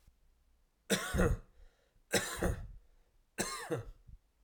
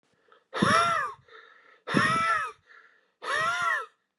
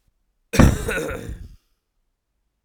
three_cough_length: 4.4 s
three_cough_amplitude: 4777
three_cough_signal_mean_std_ratio: 0.44
exhalation_length: 4.2 s
exhalation_amplitude: 12581
exhalation_signal_mean_std_ratio: 0.58
cough_length: 2.6 s
cough_amplitude: 32768
cough_signal_mean_std_ratio: 0.33
survey_phase: alpha (2021-03-01 to 2021-08-12)
age: 18-44
gender: Male
wearing_mask: 'No'
symptom_cough_any: true
symptom_shortness_of_breath: true
symptom_fatigue: true
symptom_fever_high_temperature: true
symptom_headache: true
symptom_change_to_sense_of_smell_or_taste: true
symptom_loss_of_taste: true
symptom_onset: 3 days
smoker_status: Ex-smoker
respiratory_condition_asthma: false
respiratory_condition_other: false
recruitment_source: Test and Trace
submission_delay: 2 days
covid_test_result: Positive
covid_test_method: RT-qPCR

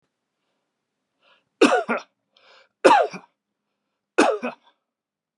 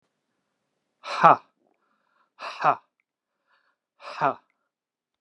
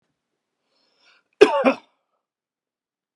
three_cough_length: 5.4 s
three_cough_amplitude: 31294
three_cough_signal_mean_std_ratio: 0.29
exhalation_length: 5.2 s
exhalation_amplitude: 31863
exhalation_signal_mean_std_ratio: 0.21
cough_length: 3.2 s
cough_amplitude: 32768
cough_signal_mean_std_ratio: 0.21
survey_phase: beta (2021-08-13 to 2022-03-07)
age: 65+
gender: Male
wearing_mask: 'No'
symptom_cough_any: true
symptom_onset: 3 days
smoker_status: Never smoked
respiratory_condition_asthma: false
respiratory_condition_other: false
recruitment_source: REACT
submission_delay: 2 days
covid_test_result: Negative
covid_test_method: RT-qPCR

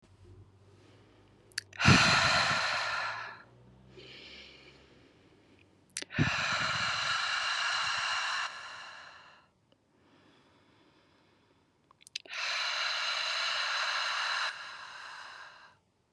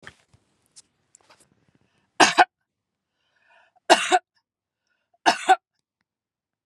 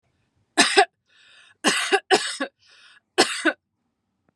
exhalation_length: 16.1 s
exhalation_amplitude: 13470
exhalation_signal_mean_std_ratio: 0.54
three_cough_length: 6.7 s
three_cough_amplitude: 32712
three_cough_signal_mean_std_ratio: 0.22
cough_length: 4.4 s
cough_amplitude: 31300
cough_signal_mean_std_ratio: 0.37
survey_phase: beta (2021-08-13 to 2022-03-07)
age: 45-64
gender: Female
wearing_mask: 'No'
symptom_none: true
smoker_status: Ex-smoker
respiratory_condition_asthma: false
respiratory_condition_other: false
recruitment_source: REACT
submission_delay: 0 days
covid_test_result: Negative
covid_test_method: RT-qPCR
influenza_a_test_result: Negative
influenza_b_test_result: Negative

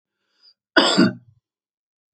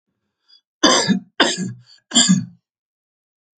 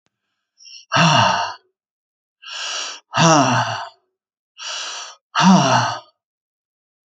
cough_length: 2.1 s
cough_amplitude: 29252
cough_signal_mean_std_ratio: 0.32
three_cough_length: 3.6 s
three_cough_amplitude: 30744
three_cough_signal_mean_std_ratio: 0.4
exhalation_length: 7.2 s
exhalation_amplitude: 32524
exhalation_signal_mean_std_ratio: 0.46
survey_phase: alpha (2021-03-01 to 2021-08-12)
age: 45-64
gender: Male
wearing_mask: 'No'
symptom_none: true
smoker_status: Never smoked
respiratory_condition_asthma: true
respiratory_condition_other: false
recruitment_source: REACT
submission_delay: 1 day
covid_test_result: Negative
covid_test_method: RT-qPCR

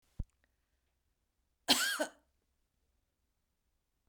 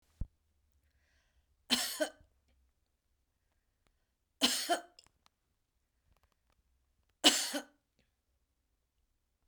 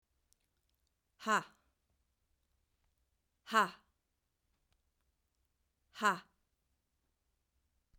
cough_length: 4.1 s
cough_amplitude: 7164
cough_signal_mean_std_ratio: 0.23
three_cough_length: 9.5 s
three_cough_amplitude: 13251
three_cough_signal_mean_std_ratio: 0.23
exhalation_length: 8.0 s
exhalation_amplitude: 4906
exhalation_signal_mean_std_ratio: 0.18
survey_phase: beta (2021-08-13 to 2022-03-07)
age: 45-64
gender: Female
wearing_mask: 'No'
symptom_headache: true
symptom_onset: 7 days
smoker_status: Never smoked
respiratory_condition_asthma: false
respiratory_condition_other: false
recruitment_source: REACT
submission_delay: 2 days
covid_test_result: Positive
covid_test_method: RT-qPCR
covid_ct_value: 28.0
covid_ct_gene: E gene
influenza_a_test_result: Negative
influenza_b_test_result: Negative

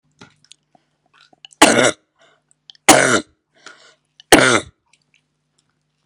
three_cough_length: 6.1 s
three_cough_amplitude: 32768
three_cough_signal_mean_std_ratio: 0.29
survey_phase: beta (2021-08-13 to 2022-03-07)
age: 45-64
gender: Female
wearing_mask: 'No'
symptom_cough_any: true
symptom_sore_throat: true
symptom_fatigue: true
symptom_headache: true
symptom_other: true
symptom_onset: 3 days
smoker_status: Never smoked
respiratory_condition_asthma: false
respiratory_condition_other: false
recruitment_source: Test and Trace
submission_delay: 1 day
covid_test_result: Positive
covid_test_method: RT-qPCR
covid_ct_value: 22.5
covid_ct_gene: N gene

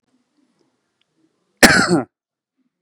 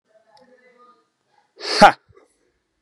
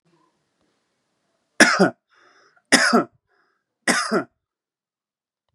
cough_length: 2.8 s
cough_amplitude: 32768
cough_signal_mean_std_ratio: 0.27
exhalation_length: 2.8 s
exhalation_amplitude: 32768
exhalation_signal_mean_std_ratio: 0.19
three_cough_length: 5.5 s
three_cough_amplitude: 32768
three_cough_signal_mean_std_ratio: 0.3
survey_phase: beta (2021-08-13 to 2022-03-07)
age: 18-44
gender: Male
wearing_mask: 'No'
symptom_none: true
smoker_status: Ex-smoker
respiratory_condition_asthma: false
respiratory_condition_other: false
recruitment_source: REACT
submission_delay: 3 days
covid_test_result: Negative
covid_test_method: RT-qPCR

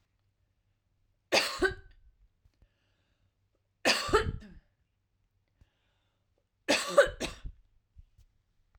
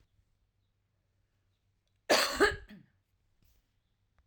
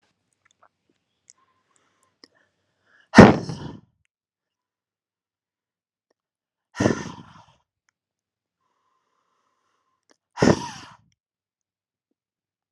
three_cough_length: 8.8 s
three_cough_amplitude: 11398
three_cough_signal_mean_std_ratio: 0.28
cough_length: 4.3 s
cough_amplitude: 7457
cough_signal_mean_std_ratio: 0.24
exhalation_length: 12.7 s
exhalation_amplitude: 32768
exhalation_signal_mean_std_ratio: 0.15
survey_phase: alpha (2021-03-01 to 2021-08-12)
age: 45-64
gender: Female
wearing_mask: 'No'
symptom_none: true
smoker_status: Never smoked
respiratory_condition_asthma: false
respiratory_condition_other: false
recruitment_source: REACT
submission_delay: 1 day
covid_test_result: Negative
covid_test_method: RT-qPCR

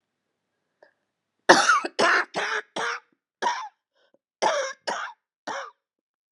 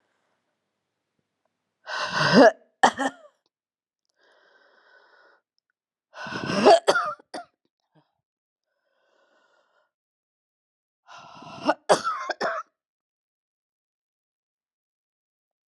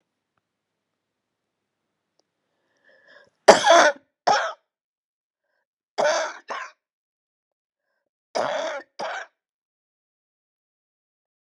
cough_length: 6.3 s
cough_amplitude: 32767
cough_signal_mean_std_ratio: 0.39
exhalation_length: 15.7 s
exhalation_amplitude: 28518
exhalation_signal_mean_std_ratio: 0.24
three_cough_length: 11.4 s
three_cough_amplitude: 32768
three_cough_signal_mean_std_ratio: 0.24
survey_phase: beta (2021-08-13 to 2022-03-07)
age: 45-64
gender: Female
wearing_mask: 'No'
symptom_cough_any: true
symptom_runny_or_blocked_nose: true
symptom_sore_throat: true
symptom_fatigue: true
symptom_headache: true
symptom_other: true
smoker_status: Never smoked
respiratory_condition_asthma: false
respiratory_condition_other: true
recruitment_source: Test and Trace
submission_delay: 2 days
covid_test_result: Positive
covid_test_method: RT-qPCR
covid_ct_value: 13.8
covid_ct_gene: ORF1ab gene
covid_ct_mean: 14.2
covid_viral_load: 23000000 copies/ml
covid_viral_load_category: High viral load (>1M copies/ml)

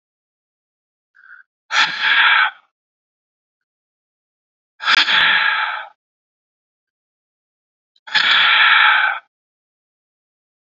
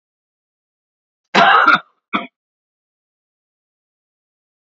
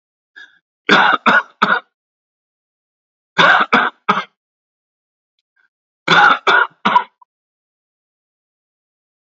exhalation_length: 10.8 s
exhalation_amplitude: 28862
exhalation_signal_mean_std_ratio: 0.41
cough_length: 4.6 s
cough_amplitude: 30866
cough_signal_mean_std_ratio: 0.27
three_cough_length: 9.2 s
three_cough_amplitude: 32767
three_cough_signal_mean_std_ratio: 0.36
survey_phase: beta (2021-08-13 to 2022-03-07)
age: 65+
gender: Male
wearing_mask: 'No'
symptom_none: true
smoker_status: Never smoked
respiratory_condition_asthma: false
respiratory_condition_other: false
recruitment_source: REACT
submission_delay: 0 days
covid_test_result: Negative
covid_test_method: RT-qPCR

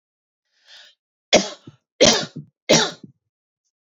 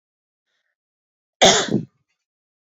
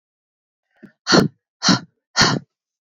three_cough_length: 3.9 s
three_cough_amplitude: 29897
three_cough_signal_mean_std_ratio: 0.29
cough_length: 2.6 s
cough_amplitude: 31048
cough_signal_mean_std_ratio: 0.27
exhalation_length: 2.9 s
exhalation_amplitude: 30059
exhalation_signal_mean_std_ratio: 0.35
survey_phase: beta (2021-08-13 to 2022-03-07)
age: 18-44
gender: Female
wearing_mask: 'No'
symptom_sore_throat: true
symptom_fatigue: true
symptom_onset: 6 days
smoker_status: Never smoked
respiratory_condition_asthma: false
respiratory_condition_other: false
recruitment_source: REACT
submission_delay: 2 days
covid_test_result: Negative
covid_test_method: RT-qPCR
covid_ct_value: 38.0
covid_ct_gene: E gene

